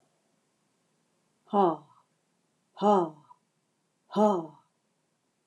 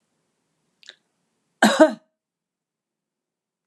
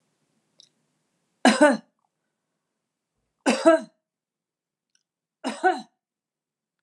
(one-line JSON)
{"exhalation_length": "5.5 s", "exhalation_amplitude": 8389, "exhalation_signal_mean_std_ratio": 0.3, "cough_length": "3.7 s", "cough_amplitude": 28795, "cough_signal_mean_std_ratio": 0.2, "three_cough_length": "6.8 s", "three_cough_amplitude": 22419, "three_cough_signal_mean_std_ratio": 0.25, "survey_phase": "beta (2021-08-13 to 2022-03-07)", "age": "45-64", "gender": "Female", "wearing_mask": "No", "symptom_none": true, "smoker_status": "Never smoked", "respiratory_condition_asthma": false, "respiratory_condition_other": false, "recruitment_source": "REACT", "submission_delay": "7 days", "covid_test_result": "Negative", "covid_test_method": "RT-qPCR"}